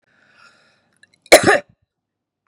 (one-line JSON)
{"cough_length": "2.5 s", "cough_amplitude": 32768, "cough_signal_mean_std_ratio": 0.23, "survey_phase": "beta (2021-08-13 to 2022-03-07)", "age": "45-64", "gender": "Female", "wearing_mask": "No", "symptom_cough_any": true, "symptom_runny_or_blocked_nose": true, "symptom_sore_throat": true, "smoker_status": "Ex-smoker", "respiratory_condition_asthma": false, "respiratory_condition_other": false, "recruitment_source": "Test and Trace", "submission_delay": "2 days", "covid_test_result": "Positive", "covid_test_method": "LFT"}